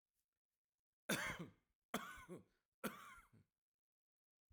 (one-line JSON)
{"three_cough_length": "4.5 s", "three_cough_amplitude": 1527, "three_cough_signal_mean_std_ratio": 0.33, "survey_phase": "alpha (2021-03-01 to 2021-08-12)", "age": "18-44", "gender": "Male", "wearing_mask": "No", "symptom_none": true, "smoker_status": "Never smoked", "respiratory_condition_asthma": false, "respiratory_condition_other": false, "recruitment_source": "REACT", "submission_delay": "1 day", "covid_test_result": "Negative", "covid_test_method": "RT-qPCR"}